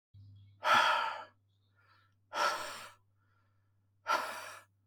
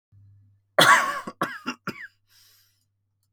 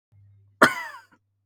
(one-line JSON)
{"exhalation_length": "4.9 s", "exhalation_amplitude": 5486, "exhalation_signal_mean_std_ratio": 0.41, "three_cough_length": "3.3 s", "three_cough_amplitude": 22876, "three_cough_signal_mean_std_ratio": 0.31, "cough_length": "1.5 s", "cough_amplitude": 32180, "cough_signal_mean_std_ratio": 0.24, "survey_phase": "beta (2021-08-13 to 2022-03-07)", "age": "18-44", "gender": "Male", "wearing_mask": "No", "symptom_none": true, "smoker_status": "Never smoked", "respiratory_condition_asthma": false, "respiratory_condition_other": false, "recruitment_source": "REACT", "submission_delay": "2 days", "covid_test_result": "Negative", "covid_test_method": "RT-qPCR", "influenza_a_test_result": "Negative", "influenza_b_test_result": "Negative"}